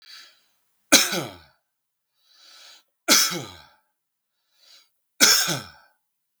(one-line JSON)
{"three_cough_length": "6.4 s", "three_cough_amplitude": 32767, "three_cough_signal_mean_std_ratio": 0.3, "survey_phase": "beta (2021-08-13 to 2022-03-07)", "age": "45-64", "gender": "Male", "wearing_mask": "No", "symptom_none": true, "smoker_status": "Never smoked", "respiratory_condition_asthma": false, "respiratory_condition_other": false, "recruitment_source": "REACT", "submission_delay": "1 day", "covid_test_result": "Negative", "covid_test_method": "RT-qPCR"}